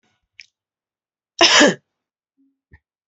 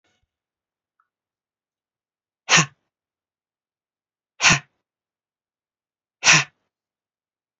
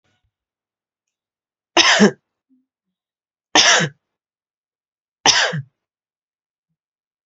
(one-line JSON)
{"cough_length": "3.1 s", "cough_amplitude": 30396, "cough_signal_mean_std_ratio": 0.26, "exhalation_length": "7.6 s", "exhalation_amplitude": 29074, "exhalation_signal_mean_std_ratio": 0.2, "three_cough_length": "7.3 s", "three_cough_amplitude": 31336, "three_cough_signal_mean_std_ratio": 0.28, "survey_phase": "alpha (2021-03-01 to 2021-08-12)", "age": "45-64", "gender": "Female", "wearing_mask": "No", "symptom_none": true, "symptom_prefer_not_to_say": true, "smoker_status": "Ex-smoker", "respiratory_condition_asthma": false, "respiratory_condition_other": false, "recruitment_source": "REACT", "submission_delay": "1 day", "covid_test_result": "Negative", "covid_test_method": "RT-qPCR"}